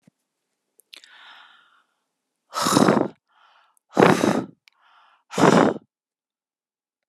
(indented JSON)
{
  "exhalation_length": "7.1 s",
  "exhalation_amplitude": 31966,
  "exhalation_signal_mean_std_ratio": 0.32,
  "survey_phase": "alpha (2021-03-01 to 2021-08-12)",
  "age": "65+",
  "gender": "Female",
  "wearing_mask": "No",
  "symptom_shortness_of_breath": true,
  "symptom_fatigue": true,
  "symptom_headache": true,
  "symptom_change_to_sense_of_smell_or_taste": true,
  "smoker_status": "Ex-smoker",
  "respiratory_condition_asthma": false,
  "respiratory_condition_other": false,
  "recruitment_source": "Test and Trace",
  "submission_delay": "2 days",
  "covid_test_result": "Positive",
  "covid_test_method": "RT-qPCR",
  "covid_ct_value": 27.1,
  "covid_ct_gene": "ORF1ab gene",
  "covid_ct_mean": 27.9,
  "covid_viral_load": "720 copies/ml",
  "covid_viral_load_category": "Minimal viral load (< 10K copies/ml)"
}